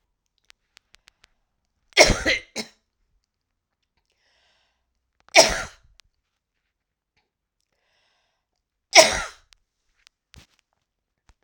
{
  "three_cough_length": "11.4 s",
  "three_cough_amplitude": 32768,
  "three_cough_signal_mean_std_ratio": 0.19,
  "survey_phase": "alpha (2021-03-01 to 2021-08-12)",
  "age": "65+",
  "gender": "Female",
  "wearing_mask": "No",
  "symptom_cough_any": true,
  "symptom_abdominal_pain": true,
  "symptom_headache": true,
  "symptom_change_to_sense_of_smell_or_taste": true,
  "smoker_status": "Never smoked",
  "respiratory_condition_asthma": false,
  "respiratory_condition_other": false,
  "recruitment_source": "Test and Trace",
  "submission_delay": "2 days",
  "covid_test_result": "Positive",
  "covid_test_method": "RT-qPCR"
}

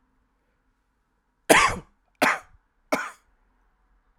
{
  "three_cough_length": "4.2 s",
  "three_cough_amplitude": 32768,
  "three_cough_signal_mean_std_ratio": 0.26,
  "survey_phase": "alpha (2021-03-01 to 2021-08-12)",
  "age": "18-44",
  "gender": "Male",
  "wearing_mask": "No",
  "symptom_cough_any": true,
  "symptom_abdominal_pain": true,
  "symptom_diarrhoea": true,
  "symptom_fatigue": true,
  "symptom_fever_high_temperature": true,
  "symptom_change_to_sense_of_smell_or_taste": true,
  "symptom_loss_of_taste": true,
  "smoker_status": "Never smoked",
  "respiratory_condition_asthma": false,
  "respiratory_condition_other": false,
  "recruitment_source": "Test and Trace",
  "submission_delay": "2 days",
  "covid_test_result": "Positive",
  "covid_test_method": "RT-qPCR",
  "covid_ct_value": 14.1,
  "covid_ct_gene": "ORF1ab gene",
  "covid_ct_mean": 14.5,
  "covid_viral_load": "18000000 copies/ml",
  "covid_viral_load_category": "High viral load (>1M copies/ml)"
}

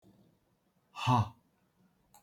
{
  "exhalation_length": "2.2 s",
  "exhalation_amplitude": 5896,
  "exhalation_signal_mean_std_ratio": 0.28,
  "survey_phase": "beta (2021-08-13 to 2022-03-07)",
  "age": "65+",
  "gender": "Male",
  "wearing_mask": "No",
  "symptom_none": true,
  "smoker_status": "Current smoker (11 or more cigarettes per day)",
  "respiratory_condition_asthma": false,
  "respiratory_condition_other": false,
  "recruitment_source": "REACT",
  "submission_delay": "2 days",
  "covid_test_result": "Negative",
  "covid_test_method": "RT-qPCR"
}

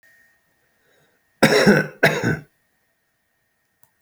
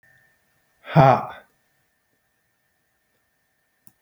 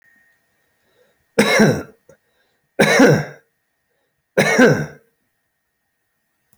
{
  "cough_length": "4.0 s",
  "cough_amplitude": 29833,
  "cough_signal_mean_std_ratio": 0.33,
  "exhalation_length": "4.0 s",
  "exhalation_amplitude": 27538,
  "exhalation_signal_mean_std_ratio": 0.2,
  "three_cough_length": "6.6 s",
  "three_cough_amplitude": 32556,
  "three_cough_signal_mean_std_ratio": 0.36,
  "survey_phase": "beta (2021-08-13 to 2022-03-07)",
  "age": "45-64",
  "gender": "Male",
  "wearing_mask": "No",
  "symptom_none": true,
  "smoker_status": "Never smoked",
  "respiratory_condition_asthma": true,
  "respiratory_condition_other": false,
  "recruitment_source": "REACT",
  "submission_delay": "7 days",
  "covid_test_result": "Negative",
  "covid_test_method": "RT-qPCR"
}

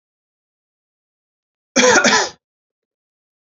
{
  "cough_length": "3.6 s",
  "cough_amplitude": 31487,
  "cough_signal_mean_std_ratio": 0.3,
  "survey_phase": "beta (2021-08-13 to 2022-03-07)",
  "age": "45-64",
  "gender": "Male",
  "wearing_mask": "No",
  "symptom_loss_of_taste": true,
  "symptom_onset": "3 days",
  "smoker_status": "Never smoked",
  "respiratory_condition_asthma": false,
  "respiratory_condition_other": false,
  "recruitment_source": "Test and Trace",
  "submission_delay": "2 days",
  "covid_test_result": "Positive",
  "covid_test_method": "RT-qPCR"
}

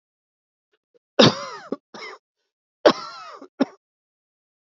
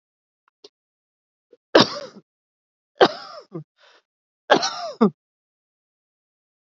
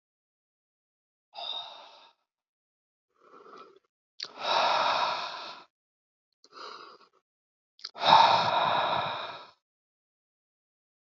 {
  "cough_length": "4.6 s",
  "cough_amplitude": 30601,
  "cough_signal_mean_std_ratio": 0.23,
  "three_cough_length": "6.7 s",
  "three_cough_amplitude": 27442,
  "three_cough_signal_mean_std_ratio": 0.23,
  "exhalation_length": "11.0 s",
  "exhalation_amplitude": 17889,
  "exhalation_signal_mean_std_ratio": 0.36,
  "survey_phase": "beta (2021-08-13 to 2022-03-07)",
  "age": "45-64",
  "gender": "Male",
  "wearing_mask": "No",
  "symptom_cough_any": true,
  "symptom_shortness_of_breath": true,
  "symptom_fatigue": true,
  "symptom_headache": true,
  "symptom_change_to_sense_of_smell_or_taste": true,
  "symptom_loss_of_taste": true,
  "symptom_onset": "10 days",
  "smoker_status": "Never smoked",
  "respiratory_condition_asthma": false,
  "respiratory_condition_other": false,
  "recruitment_source": "Test and Trace",
  "submission_delay": "2 days",
  "covid_test_result": "Positive",
  "covid_test_method": "RT-qPCR",
  "covid_ct_value": 28.3,
  "covid_ct_gene": "N gene"
}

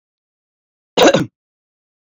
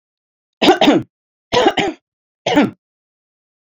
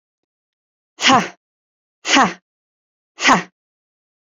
{
  "cough_length": "2.0 s",
  "cough_amplitude": 28167,
  "cough_signal_mean_std_ratio": 0.28,
  "three_cough_length": "3.8 s",
  "three_cough_amplitude": 29983,
  "three_cough_signal_mean_std_ratio": 0.39,
  "exhalation_length": "4.4 s",
  "exhalation_amplitude": 29225,
  "exhalation_signal_mean_std_ratio": 0.3,
  "survey_phase": "beta (2021-08-13 to 2022-03-07)",
  "age": "45-64",
  "gender": "Female",
  "wearing_mask": "No",
  "symptom_cough_any": true,
  "smoker_status": "Current smoker (1 to 10 cigarettes per day)",
  "respiratory_condition_asthma": false,
  "respiratory_condition_other": false,
  "recruitment_source": "REACT",
  "submission_delay": "2 days",
  "covid_test_result": "Negative",
  "covid_test_method": "RT-qPCR"
}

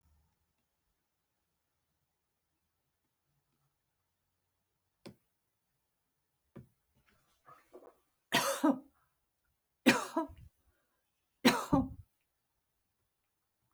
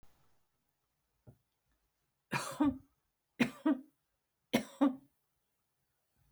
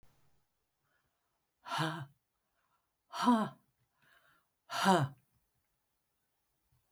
{
  "cough_length": "13.7 s",
  "cough_amplitude": 8498,
  "cough_signal_mean_std_ratio": 0.21,
  "three_cough_length": "6.3 s",
  "three_cough_amplitude": 6498,
  "three_cough_signal_mean_std_ratio": 0.27,
  "exhalation_length": "6.9 s",
  "exhalation_amplitude": 7025,
  "exhalation_signal_mean_std_ratio": 0.28,
  "survey_phase": "beta (2021-08-13 to 2022-03-07)",
  "age": "65+",
  "gender": "Female",
  "wearing_mask": "No",
  "symptom_none": true,
  "smoker_status": "Never smoked",
  "respiratory_condition_asthma": false,
  "respiratory_condition_other": false,
  "recruitment_source": "REACT",
  "submission_delay": "3 days",
  "covid_test_result": "Negative",
  "covid_test_method": "RT-qPCR",
  "influenza_a_test_result": "Negative",
  "influenza_b_test_result": "Negative"
}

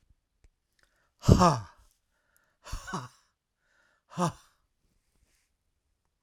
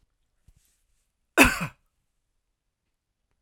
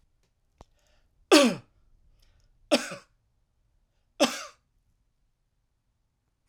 {
  "exhalation_length": "6.2 s",
  "exhalation_amplitude": 28211,
  "exhalation_signal_mean_std_ratio": 0.22,
  "cough_length": "3.4 s",
  "cough_amplitude": 32767,
  "cough_signal_mean_std_ratio": 0.18,
  "three_cough_length": "6.5 s",
  "three_cough_amplitude": 23355,
  "three_cough_signal_mean_std_ratio": 0.21,
  "survey_phase": "alpha (2021-03-01 to 2021-08-12)",
  "age": "45-64",
  "gender": "Male",
  "wearing_mask": "No",
  "symptom_none": true,
  "smoker_status": "Never smoked",
  "respiratory_condition_asthma": false,
  "respiratory_condition_other": false,
  "recruitment_source": "REACT",
  "submission_delay": "1 day",
  "covid_test_result": "Negative",
  "covid_test_method": "RT-qPCR"
}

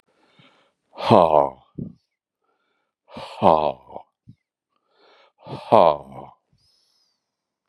{
  "exhalation_length": "7.7 s",
  "exhalation_amplitude": 31988,
  "exhalation_signal_mean_std_ratio": 0.26,
  "survey_phase": "beta (2021-08-13 to 2022-03-07)",
  "age": "65+",
  "gender": "Male",
  "wearing_mask": "No",
  "symptom_none": true,
  "smoker_status": "Ex-smoker",
  "respiratory_condition_asthma": false,
  "respiratory_condition_other": false,
  "recruitment_source": "REACT",
  "submission_delay": "2 days",
  "covid_test_result": "Negative",
  "covid_test_method": "RT-qPCR",
  "influenza_a_test_result": "Negative",
  "influenza_b_test_result": "Negative"
}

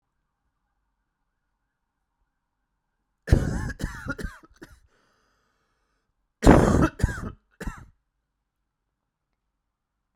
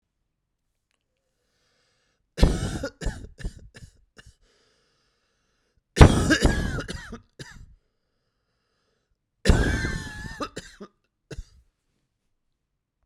{
  "cough_length": "10.2 s",
  "cough_amplitude": 30998,
  "cough_signal_mean_std_ratio": 0.24,
  "three_cough_length": "13.1 s",
  "three_cough_amplitude": 32768,
  "three_cough_signal_mean_std_ratio": 0.26,
  "survey_phase": "beta (2021-08-13 to 2022-03-07)",
  "age": "45-64",
  "gender": "Male",
  "wearing_mask": "No",
  "symptom_change_to_sense_of_smell_or_taste": true,
  "smoker_status": "Never smoked",
  "respiratory_condition_asthma": false,
  "respiratory_condition_other": false,
  "recruitment_source": "REACT",
  "submission_delay": "1 day",
  "covid_test_result": "Negative",
  "covid_test_method": "RT-qPCR"
}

